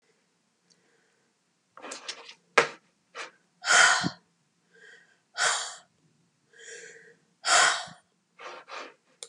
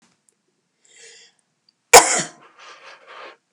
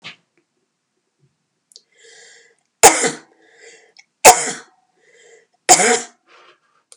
exhalation_length: 9.3 s
exhalation_amplitude: 28794
exhalation_signal_mean_std_ratio: 0.31
cough_length: 3.5 s
cough_amplitude: 32768
cough_signal_mean_std_ratio: 0.2
three_cough_length: 7.0 s
three_cough_amplitude: 32768
three_cough_signal_mean_std_ratio: 0.24
survey_phase: beta (2021-08-13 to 2022-03-07)
age: 45-64
gender: Female
wearing_mask: 'No'
symptom_none: true
smoker_status: Never smoked
respiratory_condition_asthma: false
respiratory_condition_other: false
recruitment_source: REACT
submission_delay: 2 days
covid_test_result: Negative
covid_test_method: RT-qPCR
influenza_a_test_result: Negative
influenza_b_test_result: Negative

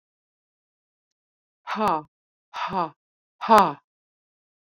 exhalation_length: 4.7 s
exhalation_amplitude: 26347
exhalation_signal_mean_std_ratio: 0.27
survey_phase: beta (2021-08-13 to 2022-03-07)
age: 45-64
gender: Female
wearing_mask: 'No'
symptom_none: true
smoker_status: Current smoker (1 to 10 cigarettes per day)
respiratory_condition_asthma: false
respiratory_condition_other: false
recruitment_source: REACT
submission_delay: 2 days
covid_test_result: Negative
covid_test_method: RT-qPCR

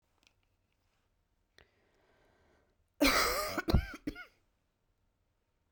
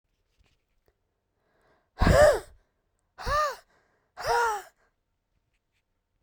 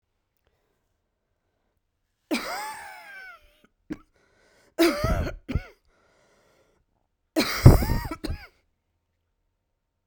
cough_length: 5.7 s
cough_amplitude: 6406
cough_signal_mean_std_ratio: 0.29
exhalation_length: 6.2 s
exhalation_amplitude: 13941
exhalation_signal_mean_std_ratio: 0.31
three_cough_length: 10.1 s
three_cough_amplitude: 32767
three_cough_signal_mean_std_ratio: 0.26
survey_phase: beta (2021-08-13 to 2022-03-07)
age: 18-44
gender: Female
wearing_mask: 'No'
symptom_cough_any: true
symptom_new_continuous_cough: true
symptom_runny_or_blocked_nose: true
symptom_sore_throat: true
symptom_fatigue: true
symptom_headache: true
symptom_change_to_sense_of_smell_or_taste: true
symptom_onset: 5 days
smoker_status: Never smoked
respiratory_condition_asthma: false
respiratory_condition_other: false
recruitment_source: REACT
submission_delay: 1 day
covid_test_result: Negative
covid_test_method: RT-qPCR
influenza_a_test_result: Negative
influenza_b_test_result: Negative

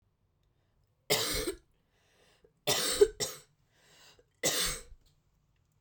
three_cough_length: 5.8 s
three_cough_amplitude: 9527
three_cough_signal_mean_std_ratio: 0.35
survey_phase: beta (2021-08-13 to 2022-03-07)
age: 18-44
gender: Female
wearing_mask: 'No'
symptom_cough_any: true
symptom_new_continuous_cough: true
symptom_runny_or_blocked_nose: true
symptom_shortness_of_breath: true
symptom_sore_throat: true
symptom_fatigue: true
symptom_headache: true
symptom_change_to_sense_of_smell_or_taste: true
symptom_onset: 3 days
smoker_status: Ex-smoker
respiratory_condition_asthma: false
respiratory_condition_other: false
recruitment_source: Test and Trace
submission_delay: 1 day
covid_test_result: Positive
covid_test_method: RT-qPCR
covid_ct_value: 23.4
covid_ct_gene: ORF1ab gene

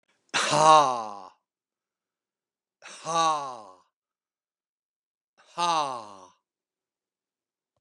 exhalation_length: 7.8 s
exhalation_amplitude: 20569
exhalation_signal_mean_std_ratio: 0.31
survey_phase: beta (2021-08-13 to 2022-03-07)
age: 65+
gender: Male
wearing_mask: 'No'
symptom_shortness_of_breath: true
symptom_fatigue: true
symptom_headache: true
symptom_onset: 12 days
smoker_status: Ex-smoker
respiratory_condition_asthma: false
respiratory_condition_other: false
recruitment_source: REACT
submission_delay: 1 day
covid_test_result: Negative
covid_test_method: RT-qPCR
influenza_a_test_result: Negative
influenza_b_test_result: Negative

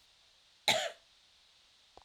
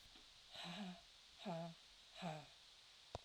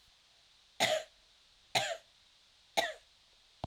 cough_length: 2.0 s
cough_amplitude: 7360
cough_signal_mean_std_ratio: 0.28
exhalation_length: 3.2 s
exhalation_amplitude: 860
exhalation_signal_mean_std_ratio: 0.69
three_cough_length: 3.7 s
three_cough_amplitude: 6352
three_cough_signal_mean_std_ratio: 0.34
survey_phase: beta (2021-08-13 to 2022-03-07)
age: 45-64
gender: Female
wearing_mask: 'No'
symptom_cough_any: true
symptom_runny_or_blocked_nose: true
symptom_fatigue: true
symptom_onset: 3 days
smoker_status: Never smoked
respiratory_condition_asthma: false
respiratory_condition_other: false
recruitment_source: Test and Trace
submission_delay: 2 days
covid_test_result: Positive
covid_test_method: RT-qPCR
covid_ct_value: 26.4
covid_ct_gene: ORF1ab gene
covid_ct_mean: 26.7
covid_viral_load: 1800 copies/ml
covid_viral_load_category: Minimal viral load (< 10K copies/ml)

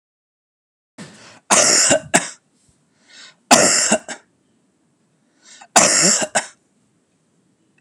three_cough_length: 7.8 s
three_cough_amplitude: 32768
three_cough_signal_mean_std_ratio: 0.38
survey_phase: beta (2021-08-13 to 2022-03-07)
age: 45-64
gender: Male
wearing_mask: 'No'
symptom_none: true
smoker_status: Never smoked
respiratory_condition_asthma: false
respiratory_condition_other: false
recruitment_source: REACT
submission_delay: 2 days
covid_test_result: Negative
covid_test_method: RT-qPCR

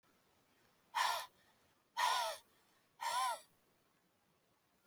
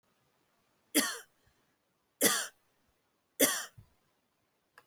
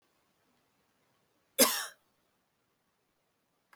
exhalation_length: 4.9 s
exhalation_amplitude: 2360
exhalation_signal_mean_std_ratio: 0.4
three_cough_length: 4.9 s
three_cough_amplitude: 10246
three_cough_signal_mean_std_ratio: 0.28
cough_length: 3.8 s
cough_amplitude: 13370
cough_signal_mean_std_ratio: 0.18
survey_phase: alpha (2021-03-01 to 2021-08-12)
age: 18-44
gender: Female
wearing_mask: 'No'
symptom_cough_any: true
smoker_status: Never smoked
respiratory_condition_asthma: false
respiratory_condition_other: false
recruitment_source: Test and Trace
submission_delay: 2 days
covid_test_result: Positive
covid_test_method: RT-qPCR
covid_ct_value: 29.2
covid_ct_gene: ORF1ab gene
covid_ct_mean: 30.2
covid_viral_load: 120 copies/ml
covid_viral_load_category: Minimal viral load (< 10K copies/ml)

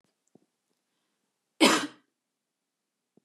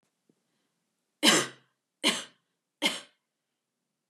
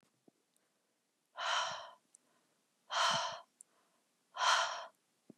cough_length: 3.2 s
cough_amplitude: 16305
cough_signal_mean_std_ratio: 0.2
three_cough_length: 4.1 s
three_cough_amplitude: 16255
three_cough_signal_mean_std_ratio: 0.27
exhalation_length: 5.4 s
exhalation_amplitude: 4115
exhalation_signal_mean_std_ratio: 0.39
survey_phase: beta (2021-08-13 to 2022-03-07)
age: 18-44
gender: Female
wearing_mask: 'No'
symptom_none: true
smoker_status: Never smoked
respiratory_condition_asthma: false
respiratory_condition_other: false
recruitment_source: REACT
submission_delay: 1 day
covid_test_result: Negative
covid_test_method: RT-qPCR
influenza_a_test_result: Negative
influenza_b_test_result: Negative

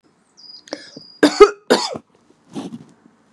three_cough_length: 3.3 s
three_cough_amplitude: 32768
three_cough_signal_mean_std_ratio: 0.27
survey_phase: beta (2021-08-13 to 2022-03-07)
age: 45-64
gender: Female
wearing_mask: 'No'
symptom_none: true
smoker_status: Never smoked
respiratory_condition_asthma: false
respiratory_condition_other: false
recruitment_source: REACT
submission_delay: 3 days
covid_test_result: Negative
covid_test_method: RT-qPCR
influenza_a_test_result: Negative
influenza_b_test_result: Negative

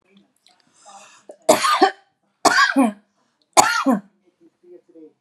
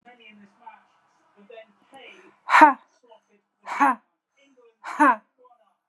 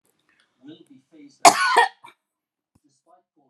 three_cough_length: 5.2 s
three_cough_amplitude: 32768
three_cough_signal_mean_std_ratio: 0.38
exhalation_length: 5.9 s
exhalation_amplitude: 28875
exhalation_signal_mean_std_ratio: 0.26
cough_length: 3.5 s
cough_amplitude: 32768
cough_signal_mean_std_ratio: 0.25
survey_phase: alpha (2021-03-01 to 2021-08-12)
age: 45-64
gender: Female
wearing_mask: 'No'
symptom_none: true
smoker_status: Never smoked
respiratory_condition_asthma: false
respiratory_condition_other: false
recruitment_source: REACT
submission_delay: 1 day
covid_test_result: Negative
covid_test_method: RT-qPCR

